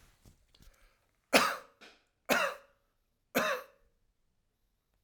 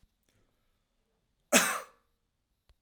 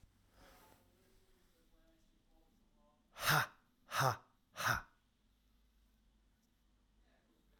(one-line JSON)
{"three_cough_length": "5.0 s", "three_cough_amplitude": 13625, "three_cough_signal_mean_std_ratio": 0.29, "cough_length": "2.8 s", "cough_amplitude": 19870, "cough_signal_mean_std_ratio": 0.22, "exhalation_length": "7.6 s", "exhalation_amplitude": 3730, "exhalation_signal_mean_std_ratio": 0.26, "survey_phase": "alpha (2021-03-01 to 2021-08-12)", "age": "45-64", "gender": "Male", "wearing_mask": "No", "symptom_none": true, "smoker_status": "Never smoked", "respiratory_condition_asthma": false, "respiratory_condition_other": false, "recruitment_source": "REACT", "submission_delay": "4 days", "covid_test_result": "Negative", "covid_test_method": "RT-qPCR"}